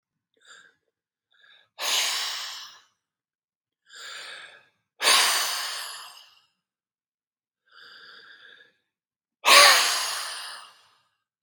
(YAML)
exhalation_length: 11.4 s
exhalation_amplitude: 31086
exhalation_signal_mean_std_ratio: 0.32
survey_phase: beta (2021-08-13 to 2022-03-07)
age: 65+
gender: Male
wearing_mask: 'No'
symptom_none: true
smoker_status: Ex-smoker
respiratory_condition_asthma: false
respiratory_condition_other: false
recruitment_source: REACT
submission_delay: 2 days
covid_test_result: Negative
covid_test_method: RT-qPCR
influenza_a_test_result: Negative
influenza_b_test_result: Negative